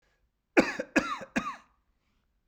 {"three_cough_length": "2.5 s", "three_cough_amplitude": 13625, "three_cough_signal_mean_std_ratio": 0.31, "survey_phase": "beta (2021-08-13 to 2022-03-07)", "age": "18-44", "gender": "Male", "wearing_mask": "No", "symptom_runny_or_blocked_nose": true, "symptom_fatigue": true, "symptom_headache": true, "smoker_status": "Never smoked", "respiratory_condition_asthma": false, "respiratory_condition_other": false, "recruitment_source": "Test and Trace", "submission_delay": "0 days", "covid_test_result": "Negative", "covid_test_method": "LFT"}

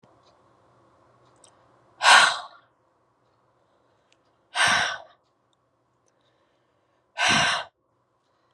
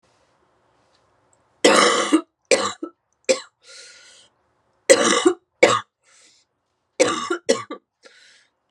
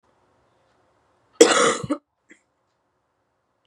{"exhalation_length": "8.5 s", "exhalation_amplitude": 26002, "exhalation_signal_mean_std_ratio": 0.28, "three_cough_length": "8.7 s", "three_cough_amplitude": 32767, "three_cough_signal_mean_std_ratio": 0.35, "cough_length": "3.7 s", "cough_amplitude": 32768, "cough_signal_mean_std_ratio": 0.24, "survey_phase": "beta (2021-08-13 to 2022-03-07)", "age": "18-44", "gender": "Female", "wearing_mask": "No", "symptom_cough_any": true, "symptom_new_continuous_cough": true, "symptom_runny_or_blocked_nose": true, "symptom_sore_throat": true, "symptom_fever_high_temperature": true, "symptom_headache": true, "symptom_change_to_sense_of_smell_or_taste": true, "symptom_loss_of_taste": true, "symptom_onset": "3 days", "smoker_status": "Current smoker (1 to 10 cigarettes per day)", "respiratory_condition_asthma": false, "respiratory_condition_other": false, "recruitment_source": "Test and Trace", "submission_delay": "2 days", "covid_test_result": "Positive", "covid_test_method": "RT-qPCR", "covid_ct_value": 21.7, "covid_ct_gene": "ORF1ab gene"}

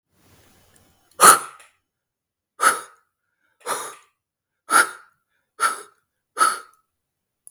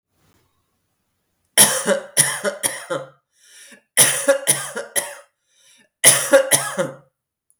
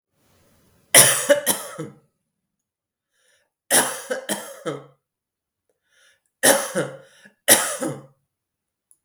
{"exhalation_length": "7.5 s", "exhalation_amplitude": 32768, "exhalation_signal_mean_std_ratio": 0.26, "cough_length": "7.6 s", "cough_amplitude": 32768, "cough_signal_mean_std_ratio": 0.41, "three_cough_length": "9.0 s", "three_cough_amplitude": 32768, "three_cough_signal_mean_std_ratio": 0.32, "survey_phase": "beta (2021-08-13 to 2022-03-07)", "age": "45-64", "gender": "Female", "wearing_mask": "No", "symptom_cough_any": true, "symptom_runny_or_blocked_nose": true, "symptom_fatigue": true, "symptom_fever_high_temperature": true, "symptom_headache": true, "symptom_onset": "3 days", "smoker_status": "Never smoked", "respiratory_condition_asthma": false, "respiratory_condition_other": false, "recruitment_source": "Test and Trace", "submission_delay": "2 days", "covid_test_result": "Positive", "covid_test_method": "RT-qPCR", "covid_ct_value": 17.2, "covid_ct_gene": "ORF1ab gene", "covid_ct_mean": 17.7, "covid_viral_load": "1500000 copies/ml", "covid_viral_load_category": "High viral load (>1M copies/ml)"}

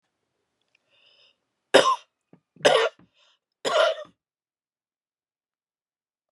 {"three_cough_length": "6.3 s", "three_cough_amplitude": 27273, "three_cough_signal_mean_std_ratio": 0.27, "survey_phase": "beta (2021-08-13 to 2022-03-07)", "age": "45-64", "gender": "Female", "wearing_mask": "No", "symptom_cough_any": true, "symptom_runny_or_blocked_nose": true, "symptom_sore_throat": true, "symptom_fatigue": true, "symptom_headache": true, "symptom_change_to_sense_of_smell_or_taste": true, "symptom_loss_of_taste": true, "smoker_status": "Never smoked", "respiratory_condition_asthma": false, "respiratory_condition_other": false, "recruitment_source": "Test and Trace", "submission_delay": "2 days", "covid_test_result": "Positive", "covid_test_method": "RT-qPCR", "covid_ct_value": 23.6, "covid_ct_gene": "ORF1ab gene"}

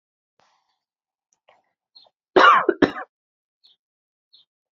{"cough_length": "4.8 s", "cough_amplitude": 32094, "cough_signal_mean_std_ratio": 0.22, "survey_phase": "alpha (2021-03-01 to 2021-08-12)", "age": "18-44", "gender": "Female", "wearing_mask": "No", "symptom_new_continuous_cough": true, "symptom_shortness_of_breath": true, "symptom_fatigue": true, "symptom_change_to_sense_of_smell_or_taste": true, "symptom_loss_of_taste": true, "symptom_onset": "6 days", "smoker_status": "Never smoked", "respiratory_condition_asthma": false, "respiratory_condition_other": false, "recruitment_source": "Test and Trace", "submission_delay": "3 days", "covid_test_result": "Positive", "covid_test_method": "RT-qPCR", "covid_ct_value": 14.7, "covid_ct_gene": "ORF1ab gene", "covid_ct_mean": 14.8, "covid_viral_load": "14000000 copies/ml", "covid_viral_load_category": "High viral load (>1M copies/ml)"}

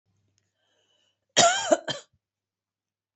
{"cough_length": "3.2 s", "cough_amplitude": 18037, "cough_signal_mean_std_ratio": 0.27, "survey_phase": "beta (2021-08-13 to 2022-03-07)", "age": "65+", "gender": "Female", "wearing_mask": "No", "symptom_cough_any": true, "symptom_headache": true, "symptom_onset": "6 days", "smoker_status": "Ex-smoker", "respiratory_condition_asthma": false, "respiratory_condition_other": false, "recruitment_source": "REACT", "submission_delay": "1 day", "covid_test_result": "Negative", "covid_test_method": "RT-qPCR", "influenza_a_test_result": "Negative", "influenza_b_test_result": "Negative"}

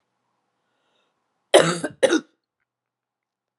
{"cough_length": "3.6 s", "cough_amplitude": 32767, "cough_signal_mean_std_ratio": 0.24, "survey_phase": "beta (2021-08-13 to 2022-03-07)", "age": "45-64", "gender": "Female", "wearing_mask": "No", "symptom_cough_any": true, "symptom_sore_throat": true, "symptom_fatigue": true, "symptom_headache": true, "smoker_status": "Never smoked", "respiratory_condition_asthma": false, "respiratory_condition_other": false, "recruitment_source": "Test and Trace", "submission_delay": "2 days", "covid_test_result": "Positive", "covid_test_method": "ePCR"}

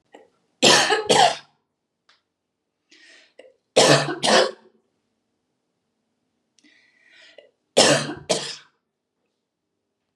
{"three_cough_length": "10.2 s", "three_cough_amplitude": 28864, "three_cough_signal_mean_std_ratio": 0.33, "survey_phase": "beta (2021-08-13 to 2022-03-07)", "age": "45-64", "gender": "Female", "wearing_mask": "No", "symptom_none": true, "smoker_status": "Never smoked", "respiratory_condition_asthma": false, "respiratory_condition_other": false, "recruitment_source": "REACT", "submission_delay": "1 day", "covid_test_result": "Negative", "covid_test_method": "RT-qPCR"}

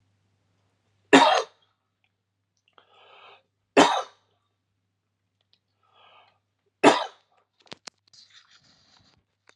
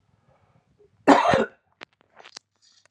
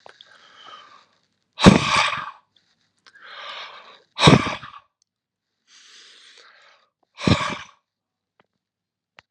{"three_cough_length": "9.6 s", "three_cough_amplitude": 31512, "three_cough_signal_mean_std_ratio": 0.21, "cough_length": "2.9 s", "cough_amplitude": 32762, "cough_signal_mean_std_ratio": 0.27, "exhalation_length": "9.3 s", "exhalation_amplitude": 32768, "exhalation_signal_mean_std_ratio": 0.26, "survey_phase": "beta (2021-08-13 to 2022-03-07)", "age": "45-64", "gender": "Male", "wearing_mask": "No", "symptom_none": true, "smoker_status": "Ex-smoker", "respiratory_condition_asthma": false, "respiratory_condition_other": false, "recruitment_source": "REACT", "submission_delay": "1 day", "covid_test_result": "Negative", "covid_test_method": "RT-qPCR", "influenza_a_test_result": "Negative", "influenza_b_test_result": "Negative"}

